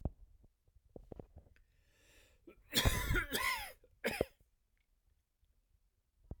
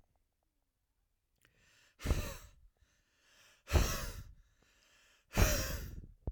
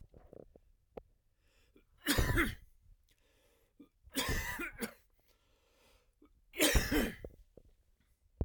{
  "cough_length": "6.4 s",
  "cough_amplitude": 5164,
  "cough_signal_mean_std_ratio": 0.34,
  "exhalation_length": "6.3 s",
  "exhalation_amplitude": 6152,
  "exhalation_signal_mean_std_ratio": 0.35,
  "three_cough_length": "8.4 s",
  "three_cough_amplitude": 6839,
  "three_cough_signal_mean_std_ratio": 0.36,
  "survey_phase": "alpha (2021-03-01 to 2021-08-12)",
  "age": "18-44",
  "gender": "Male",
  "wearing_mask": "No",
  "symptom_none": true,
  "smoker_status": "Ex-smoker",
  "respiratory_condition_asthma": false,
  "respiratory_condition_other": false,
  "recruitment_source": "REACT",
  "submission_delay": "1 day",
  "covid_test_result": "Negative",
  "covid_test_method": "RT-qPCR"
}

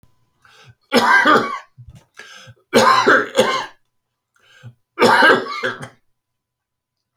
{
  "three_cough_length": "7.2 s",
  "three_cough_amplitude": 29316,
  "three_cough_signal_mean_std_ratio": 0.44,
  "survey_phase": "beta (2021-08-13 to 2022-03-07)",
  "age": "65+",
  "gender": "Male",
  "wearing_mask": "No",
  "symptom_cough_any": true,
  "symptom_fatigue": true,
  "smoker_status": "Never smoked",
  "respiratory_condition_asthma": false,
  "respiratory_condition_other": false,
  "recruitment_source": "REACT",
  "submission_delay": "3 days",
  "covid_test_result": "Negative",
  "covid_test_method": "RT-qPCR"
}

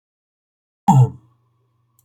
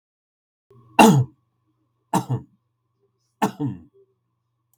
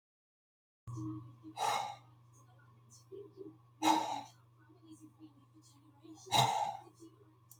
{
  "cough_length": "2.0 s",
  "cough_amplitude": 31137,
  "cough_signal_mean_std_ratio": 0.27,
  "three_cough_length": "4.8 s",
  "three_cough_amplitude": 32768,
  "three_cough_signal_mean_std_ratio": 0.26,
  "exhalation_length": "7.6 s",
  "exhalation_amplitude": 4799,
  "exhalation_signal_mean_std_ratio": 0.39,
  "survey_phase": "beta (2021-08-13 to 2022-03-07)",
  "age": "45-64",
  "gender": "Male",
  "wearing_mask": "No",
  "symptom_runny_or_blocked_nose": true,
  "symptom_fatigue": true,
  "symptom_change_to_sense_of_smell_or_taste": true,
  "symptom_loss_of_taste": true,
  "symptom_onset": "12 days",
  "smoker_status": "Never smoked",
  "respiratory_condition_asthma": true,
  "respiratory_condition_other": false,
  "recruitment_source": "REACT",
  "submission_delay": "5 days",
  "covid_test_result": "Negative",
  "covid_test_method": "RT-qPCR",
  "influenza_a_test_result": "Negative",
  "influenza_b_test_result": "Negative"
}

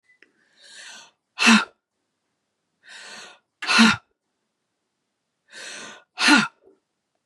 {
  "exhalation_length": "7.3 s",
  "exhalation_amplitude": 28184,
  "exhalation_signal_mean_std_ratio": 0.28,
  "survey_phase": "beta (2021-08-13 to 2022-03-07)",
  "age": "45-64",
  "gender": "Female",
  "wearing_mask": "No",
  "symptom_cough_any": true,
  "symptom_runny_or_blocked_nose": true,
  "symptom_sore_throat": true,
  "symptom_headache": true,
  "symptom_onset": "3 days",
  "smoker_status": "Never smoked",
  "respiratory_condition_asthma": false,
  "respiratory_condition_other": false,
  "recruitment_source": "Test and Trace",
  "submission_delay": "1 day",
  "covid_test_result": "Negative",
  "covid_test_method": "RT-qPCR"
}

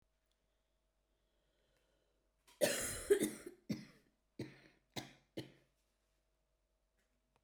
{
  "cough_length": "7.4 s",
  "cough_amplitude": 3661,
  "cough_signal_mean_std_ratio": 0.26,
  "survey_phase": "beta (2021-08-13 to 2022-03-07)",
  "age": "45-64",
  "gender": "Female",
  "wearing_mask": "No",
  "symptom_cough_any": true,
  "symptom_fatigue": true,
  "symptom_onset": "4 days",
  "smoker_status": "Never smoked",
  "respiratory_condition_asthma": true,
  "respiratory_condition_other": false,
  "recruitment_source": "REACT",
  "submission_delay": "1 day",
  "covid_test_result": "Negative",
  "covid_test_method": "RT-qPCR",
  "influenza_a_test_result": "Negative",
  "influenza_b_test_result": "Negative"
}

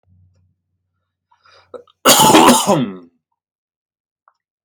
{
  "cough_length": "4.6 s",
  "cough_amplitude": 32768,
  "cough_signal_mean_std_ratio": 0.35,
  "survey_phase": "alpha (2021-03-01 to 2021-08-12)",
  "age": "18-44",
  "gender": "Male",
  "wearing_mask": "No",
  "symptom_none": true,
  "smoker_status": "Never smoked",
  "respiratory_condition_asthma": false,
  "respiratory_condition_other": false,
  "recruitment_source": "REACT",
  "submission_delay": "1 day",
  "covid_test_result": "Negative",
  "covid_test_method": "RT-qPCR"
}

